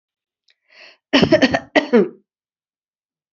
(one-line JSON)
{"cough_length": "3.3 s", "cough_amplitude": 28567, "cough_signal_mean_std_ratio": 0.34, "survey_phase": "alpha (2021-03-01 to 2021-08-12)", "age": "65+", "gender": "Female", "wearing_mask": "No", "symptom_cough_any": true, "symptom_fatigue": true, "symptom_fever_high_temperature": true, "symptom_headache": true, "symptom_change_to_sense_of_smell_or_taste": true, "symptom_onset": "3 days", "smoker_status": "Never smoked", "respiratory_condition_asthma": false, "respiratory_condition_other": false, "recruitment_source": "Test and Trace", "submission_delay": "2 days", "covid_test_result": "Positive", "covid_test_method": "RT-qPCR", "covid_ct_value": 15.5, "covid_ct_gene": "ORF1ab gene", "covid_ct_mean": 20.0, "covid_viral_load": "270000 copies/ml", "covid_viral_load_category": "Low viral load (10K-1M copies/ml)"}